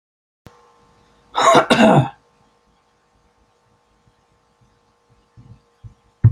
{
  "cough_length": "6.3 s",
  "cough_amplitude": 29875,
  "cough_signal_mean_std_ratio": 0.28,
  "survey_phase": "beta (2021-08-13 to 2022-03-07)",
  "age": "65+",
  "gender": "Male",
  "wearing_mask": "No",
  "symptom_runny_or_blocked_nose": true,
  "smoker_status": "Never smoked",
  "respiratory_condition_asthma": true,
  "respiratory_condition_other": true,
  "recruitment_source": "REACT",
  "submission_delay": "1 day",
  "covid_test_result": "Negative",
  "covid_test_method": "RT-qPCR"
}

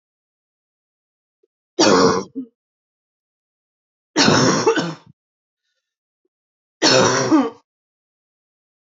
{
  "three_cough_length": "9.0 s",
  "three_cough_amplitude": 26653,
  "three_cough_signal_mean_std_ratio": 0.37,
  "survey_phase": "alpha (2021-03-01 to 2021-08-12)",
  "age": "18-44",
  "gender": "Female",
  "wearing_mask": "No",
  "symptom_cough_any": true,
  "symptom_fatigue": true,
  "symptom_headache": true,
  "symptom_change_to_sense_of_smell_or_taste": true,
  "symptom_loss_of_taste": true,
  "symptom_onset": "5 days",
  "smoker_status": "Never smoked",
  "respiratory_condition_asthma": true,
  "respiratory_condition_other": false,
  "recruitment_source": "Test and Trace",
  "submission_delay": "1 day",
  "covid_test_result": "Positive",
  "covid_test_method": "RT-qPCR",
  "covid_ct_value": 15.4,
  "covid_ct_gene": "ORF1ab gene",
  "covid_ct_mean": 15.8,
  "covid_viral_load": "6800000 copies/ml",
  "covid_viral_load_category": "High viral load (>1M copies/ml)"
}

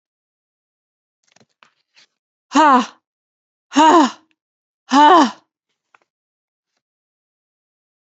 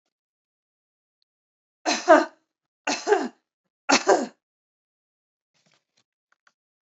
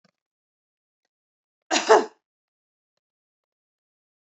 {
  "exhalation_length": "8.2 s",
  "exhalation_amplitude": 28449,
  "exhalation_signal_mean_std_ratio": 0.29,
  "three_cough_length": "6.8 s",
  "three_cough_amplitude": 28491,
  "three_cough_signal_mean_std_ratio": 0.25,
  "cough_length": "4.3 s",
  "cough_amplitude": 26821,
  "cough_signal_mean_std_ratio": 0.18,
  "survey_phase": "beta (2021-08-13 to 2022-03-07)",
  "age": "18-44",
  "gender": "Female",
  "wearing_mask": "No",
  "symptom_cough_any": true,
  "symptom_new_continuous_cough": true,
  "symptom_sore_throat": true,
  "symptom_abdominal_pain": true,
  "symptom_fatigue": true,
  "symptom_onset": "4 days",
  "smoker_status": "Never smoked",
  "respiratory_condition_asthma": false,
  "respiratory_condition_other": false,
  "recruitment_source": "Test and Trace",
  "submission_delay": "2 days",
  "covid_test_result": "Positive",
  "covid_test_method": "ePCR"
}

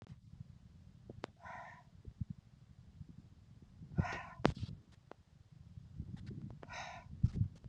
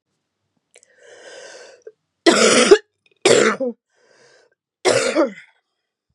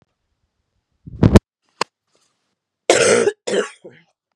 {
  "exhalation_length": "7.7 s",
  "exhalation_amplitude": 11070,
  "exhalation_signal_mean_std_ratio": 0.39,
  "three_cough_length": "6.1 s",
  "three_cough_amplitude": 32768,
  "three_cough_signal_mean_std_ratio": 0.37,
  "cough_length": "4.4 s",
  "cough_amplitude": 32768,
  "cough_signal_mean_std_ratio": 0.31,
  "survey_phase": "beta (2021-08-13 to 2022-03-07)",
  "age": "45-64",
  "gender": "Female",
  "wearing_mask": "No",
  "symptom_cough_any": true,
  "symptom_runny_or_blocked_nose": true,
  "symptom_shortness_of_breath": true,
  "symptom_sore_throat": true,
  "symptom_headache": true,
  "symptom_change_to_sense_of_smell_or_taste": true,
  "symptom_other": true,
  "symptom_onset": "12 days",
  "smoker_status": "Ex-smoker",
  "respiratory_condition_asthma": false,
  "respiratory_condition_other": false,
  "recruitment_source": "REACT",
  "submission_delay": "3 days",
  "covid_test_result": "Negative",
  "covid_test_method": "RT-qPCR",
  "influenza_a_test_result": "Negative",
  "influenza_b_test_result": "Negative"
}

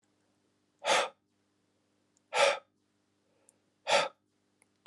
{
  "exhalation_length": "4.9 s",
  "exhalation_amplitude": 8785,
  "exhalation_signal_mean_std_ratio": 0.29,
  "survey_phase": "alpha (2021-03-01 to 2021-08-12)",
  "age": "45-64",
  "gender": "Male",
  "wearing_mask": "No",
  "symptom_none": true,
  "smoker_status": "Never smoked",
  "respiratory_condition_asthma": false,
  "respiratory_condition_other": false,
  "recruitment_source": "REACT",
  "submission_delay": "1 day",
  "covid_test_result": "Negative",
  "covid_test_method": "RT-qPCR"
}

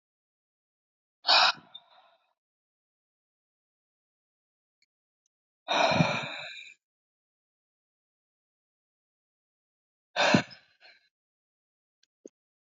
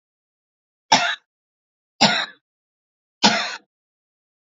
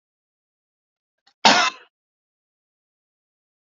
{
  "exhalation_length": "12.6 s",
  "exhalation_amplitude": 14405,
  "exhalation_signal_mean_std_ratio": 0.23,
  "three_cough_length": "4.4 s",
  "three_cough_amplitude": 29408,
  "three_cough_signal_mean_std_ratio": 0.29,
  "cough_length": "3.8 s",
  "cough_amplitude": 29755,
  "cough_signal_mean_std_ratio": 0.19,
  "survey_phase": "beta (2021-08-13 to 2022-03-07)",
  "age": "45-64",
  "gender": "Female",
  "wearing_mask": "No",
  "symptom_none": true,
  "smoker_status": "Never smoked",
  "respiratory_condition_asthma": true,
  "respiratory_condition_other": false,
  "recruitment_source": "Test and Trace",
  "submission_delay": "0 days",
  "covid_test_result": "Negative",
  "covid_test_method": "LFT"
}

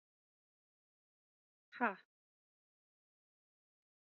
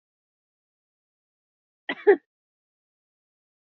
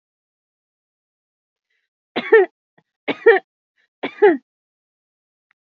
{
  "exhalation_length": "4.0 s",
  "exhalation_amplitude": 2538,
  "exhalation_signal_mean_std_ratio": 0.14,
  "cough_length": "3.8 s",
  "cough_amplitude": 16081,
  "cough_signal_mean_std_ratio": 0.14,
  "three_cough_length": "5.7 s",
  "three_cough_amplitude": 28805,
  "three_cough_signal_mean_std_ratio": 0.24,
  "survey_phase": "beta (2021-08-13 to 2022-03-07)",
  "age": "18-44",
  "gender": "Female",
  "wearing_mask": "No",
  "symptom_cough_any": true,
  "symptom_runny_or_blocked_nose": true,
  "symptom_shortness_of_breath": true,
  "symptom_sore_throat": true,
  "symptom_fatigue": true,
  "symptom_headache": true,
  "symptom_onset": "4 days",
  "smoker_status": "Never smoked",
  "respiratory_condition_asthma": true,
  "respiratory_condition_other": false,
  "recruitment_source": "Test and Trace",
  "submission_delay": "1 day",
  "covid_test_result": "Positive",
  "covid_test_method": "RT-qPCR",
  "covid_ct_value": 25.0,
  "covid_ct_gene": "N gene"
}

